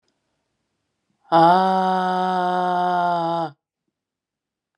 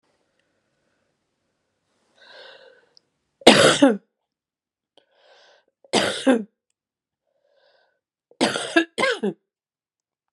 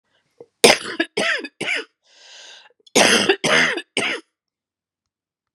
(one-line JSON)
{"exhalation_length": "4.8 s", "exhalation_amplitude": 25349, "exhalation_signal_mean_std_ratio": 0.53, "three_cough_length": "10.3 s", "three_cough_amplitude": 32768, "three_cough_signal_mean_std_ratio": 0.27, "cough_length": "5.5 s", "cough_amplitude": 32768, "cough_signal_mean_std_ratio": 0.41, "survey_phase": "beta (2021-08-13 to 2022-03-07)", "age": "45-64", "gender": "Female", "wearing_mask": "Prefer not to say", "symptom_cough_any": true, "symptom_runny_or_blocked_nose": true, "symptom_sore_throat": true, "symptom_fatigue": true, "symptom_headache": true, "symptom_change_to_sense_of_smell_or_taste": true, "symptom_loss_of_taste": true, "symptom_onset": "7 days", "smoker_status": "Never smoked", "respiratory_condition_asthma": false, "respiratory_condition_other": false, "recruitment_source": "Test and Trace", "submission_delay": "2 days", "covid_test_result": "Positive", "covid_test_method": "LAMP"}